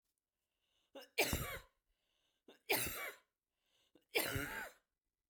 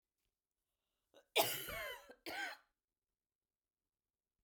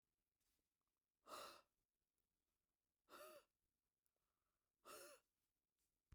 {"three_cough_length": "5.3 s", "three_cough_amplitude": 2975, "three_cough_signal_mean_std_ratio": 0.38, "cough_length": "4.4 s", "cough_amplitude": 3762, "cough_signal_mean_std_ratio": 0.29, "exhalation_length": "6.1 s", "exhalation_amplitude": 173, "exhalation_signal_mean_std_ratio": 0.33, "survey_phase": "beta (2021-08-13 to 2022-03-07)", "age": "45-64", "gender": "Female", "wearing_mask": "No", "symptom_cough_any": true, "symptom_diarrhoea": true, "symptom_fatigue": true, "symptom_headache": true, "smoker_status": "Ex-smoker", "respiratory_condition_asthma": false, "respiratory_condition_other": false, "recruitment_source": "REACT", "submission_delay": "0 days", "covid_test_result": "Negative", "covid_test_method": "RT-qPCR"}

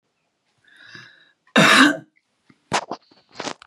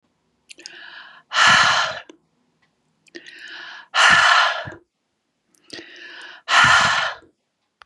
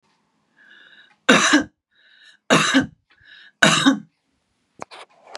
{"cough_length": "3.7 s", "cough_amplitude": 32484, "cough_signal_mean_std_ratio": 0.31, "exhalation_length": "7.9 s", "exhalation_amplitude": 32739, "exhalation_signal_mean_std_ratio": 0.43, "three_cough_length": "5.4 s", "three_cough_amplitude": 32768, "three_cough_signal_mean_std_ratio": 0.36, "survey_phase": "beta (2021-08-13 to 2022-03-07)", "age": "45-64", "gender": "Female", "wearing_mask": "No", "symptom_cough_any": true, "symptom_runny_or_blocked_nose": true, "symptom_sore_throat": true, "symptom_fatigue": true, "symptom_headache": true, "smoker_status": "Never smoked", "respiratory_condition_asthma": false, "respiratory_condition_other": false, "recruitment_source": "REACT", "submission_delay": "2 days", "covid_test_result": "Negative", "covid_test_method": "RT-qPCR", "influenza_a_test_result": "Negative", "influenza_b_test_result": "Negative"}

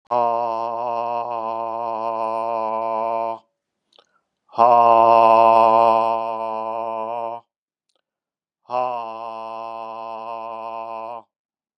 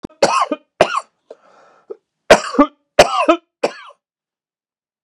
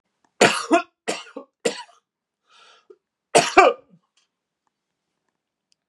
{"exhalation_length": "11.8 s", "exhalation_amplitude": 29974, "exhalation_signal_mean_std_ratio": 0.51, "cough_length": "5.0 s", "cough_amplitude": 32768, "cough_signal_mean_std_ratio": 0.33, "three_cough_length": "5.9 s", "three_cough_amplitude": 32767, "three_cough_signal_mean_std_ratio": 0.27, "survey_phase": "beta (2021-08-13 to 2022-03-07)", "age": "65+", "gender": "Male", "wearing_mask": "No", "symptom_none": true, "smoker_status": "Never smoked", "respiratory_condition_asthma": false, "respiratory_condition_other": false, "recruitment_source": "REACT", "submission_delay": "2 days", "covid_test_result": "Negative", "covid_test_method": "RT-qPCR", "influenza_a_test_result": "Negative", "influenza_b_test_result": "Negative"}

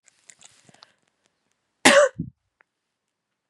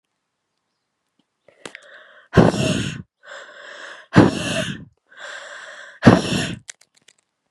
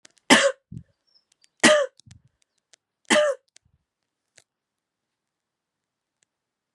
{"cough_length": "3.5 s", "cough_amplitude": 32767, "cough_signal_mean_std_ratio": 0.22, "exhalation_length": "7.5 s", "exhalation_amplitude": 32768, "exhalation_signal_mean_std_ratio": 0.33, "three_cough_length": "6.7 s", "three_cough_amplitude": 31724, "three_cough_signal_mean_std_ratio": 0.25, "survey_phase": "beta (2021-08-13 to 2022-03-07)", "age": "18-44", "gender": "Female", "wearing_mask": "No", "symptom_none": true, "smoker_status": "Ex-smoker", "respiratory_condition_asthma": false, "respiratory_condition_other": false, "recruitment_source": "Test and Trace", "submission_delay": "2 days", "covid_test_result": "Positive", "covid_test_method": "RT-qPCR", "covid_ct_value": 34.2, "covid_ct_gene": "N gene"}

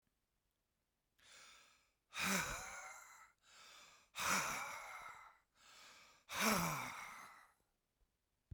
{"exhalation_length": "8.5 s", "exhalation_amplitude": 2303, "exhalation_signal_mean_std_ratio": 0.44, "survey_phase": "beta (2021-08-13 to 2022-03-07)", "age": "65+", "gender": "Male", "wearing_mask": "No", "symptom_none": true, "smoker_status": "Ex-smoker", "respiratory_condition_asthma": false, "respiratory_condition_other": false, "recruitment_source": "REACT", "submission_delay": "1 day", "covid_test_result": "Negative", "covid_test_method": "RT-qPCR"}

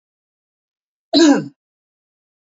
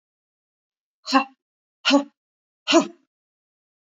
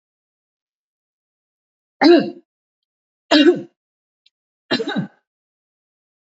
{"cough_length": "2.6 s", "cough_amplitude": 29332, "cough_signal_mean_std_ratio": 0.28, "exhalation_length": "3.8 s", "exhalation_amplitude": 23715, "exhalation_signal_mean_std_ratio": 0.27, "three_cough_length": "6.2 s", "three_cough_amplitude": 27764, "three_cough_signal_mean_std_ratio": 0.27, "survey_phase": "beta (2021-08-13 to 2022-03-07)", "age": "45-64", "gender": "Female", "wearing_mask": "No", "symptom_none": true, "smoker_status": "Ex-smoker", "respiratory_condition_asthma": false, "respiratory_condition_other": false, "recruitment_source": "Test and Trace", "submission_delay": "2 days", "covid_test_result": "Negative", "covid_test_method": "RT-qPCR"}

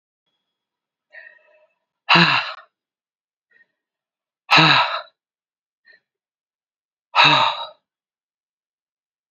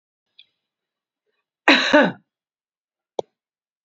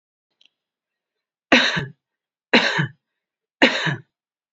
{"exhalation_length": "9.3 s", "exhalation_amplitude": 32767, "exhalation_signal_mean_std_ratio": 0.29, "cough_length": "3.8 s", "cough_amplitude": 28096, "cough_signal_mean_std_ratio": 0.24, "three_cough_length": "4.5 s", "three_cough_amplitude": 32768, "three_cough_signal_mean_std_ratio": 0.33, "survey_phase": "beta (2021-08-13 to 2022-03-07)", "age": "45-64", "gender": "Female", "wearing_mask": "No", "symptom_runny_or_blocked_nose": true, "symptom_fatigue": true, "symptom_change_to_sense_of_smell_or_taste": true, "symptom_loss_of_taste": true, "symptom_onset": "3 days", "smoker_status": "Ex-smoker", "respiratory_condition_asthma": false, "respiratory_condition_other": false, "recruitment_source": "Test and Trace", "submission_delay": "2 days", "covid_test_result": "Positive", "covid_test_method": "LAMP"}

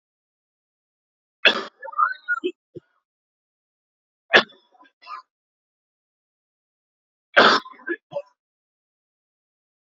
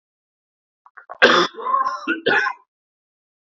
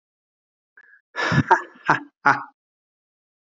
{"three_cough_length": "9.8 s", "three_cough_amplitude": 28959, "three_cough_signal_mean_std_ratio": 0.22, "cough_length": "3.6 s", "cough_amplitude": 30045, "cough_signal_mean_std_ratio": 0.41, "exhalation_length": "3.4 s", "exhalation_amplitude": 28711, "exhalation_signal_mean_std_ratio": 0.31, "survey_phase": "beta (2021-08-13 to 2022-03-07)", "age": "18-44", "gender": "Male", "wearing_mask": "No", "symptom_cough_any": true, "symptom_fatigue": true, "symptom_headache": true, "smoker_status": "Ex-smoker", "respiratory_condition_asthma": false, "respiratory_condition_other": false, "recruitment_source": "Test and Trace", "submission_delay": "2 days", "covid_test_result": "Positive", "covid_test_method": "ePCR"}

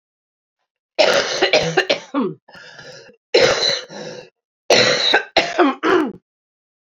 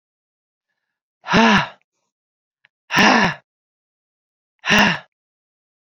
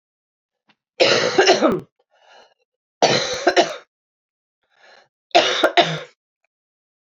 {"cough_length": "7.0 s", "cough_amplitude": 32767, "cough_signal_mean_std_ratio": 0.52, "exhalation_length": "5.8 s", "exhalation_amplitude": 30525, "exhalation_signal_mean_std_ratio": 0.34, "three_cough_length": "7.2 s", "three_cough_amplitude": 27715, "three_cough_signal_mean_std_ratio": 0.39, "survey_phase": "beta (2021-08-13 to 2022-03-07)", "age": "45-64", "gender": "Female", "wearing_mask": "No", "symptom_cough_any": true, "symptom_runny_or_blocked_nose": true, "symptom_sore_throat": true, "symptom_fatigue": true, "symptom_fever_high_temperature": true, "symptom_onset": "4 days", "smoker_status": "Never smoked", "respiratory_condition_asthma": false, "respiratory_condition_other": false, "recruitment_source": "Test and Trace", "submission_delay": "1 day", "covid_test_result": "Positive", "covid_test_method": "RT-qPCR", "covid_ct_value": 25.6, "covid_ct_gene": "N gene"}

